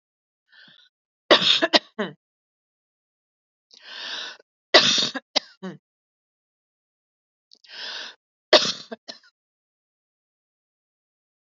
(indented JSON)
{
  "three_cough_length": "11.4 s",
  "three_cough_amplitude": 32380,
  "three_cough_signal_mean_std_ratio": 0.24,
  "survey_phase": "alpha (2021-03-01 to 2021-08-12)",
  "age": "45-64",
  "gender": "Female",
  "wearing_mask": "No",
  "symptom_none": true,
  "smoker_status": "Never smoked",
  "respiratory_condition_asthma": false,
  "respiratory_condition_other": false,
  "recruitment_source": "REACT",
  "submission_delay": "1 day",
  "covid_test_result": "Negative",
  "covid_test_method": "RT-qPCR"
}